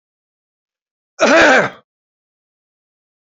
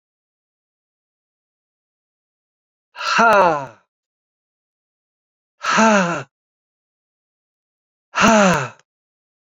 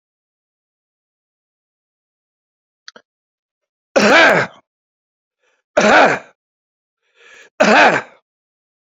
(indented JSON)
{
  "cough_length": "3.2 s",
  "cough_amplitude": 30681,
  "cough_signal_mean_std_ratio": 0.32,
  "exhalation_length": "9.6 s",
  "exhalation_amplitude": 31010,
  "exhalation_signal_mean_std_ratio": 0.32,
  "three_cough_length": "8.9 s",
  "three_cough_amplitude": 29025,
  "three_cough_signal_mean_std_ratio": 0.32,
  "survey_phase": "beta (2021-08-13 to 2022-03-07)",
  "age": "65+",
  "gender": "Male",
  "wearing_mask": "No",
  "symptom_none": true,
  "smoker_status": "Ex-smoker",
  "respiratory_condition_asthma": false,
  "respiratory_condition_other": false,
  "recruitment_source": "REACT",
  "submission_delay": "2 days",
  "covid_test_result": "Negative",
  "covid_test_method": "RT-qPCR"
}